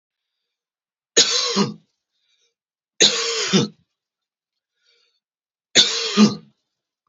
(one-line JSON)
{"three_cough_length": "7.1 s", "three_cough_amplitude": 32767, "three_cough_signal_mean_std_ratio": 0.35, "survey_phase": "beta (2021-08-13 to 2022-03-07)", "age": "45-64", "gender": "Male", "wearing_mask": "No", "symptom_none": true, "symptom_onset": "8 days", "smoker_status": "Ex-smoker", "respiratory_condition_asthma": false, "respiratory_condition_other": false, "recruitment_source": "REACT", "submission_delay": "2 days", "covid_test_result": "Negative", "covid_test_method": "RT-qPCR", "influenza_a_test_result": "Negative", "influenza_b_test_result": "Negative"}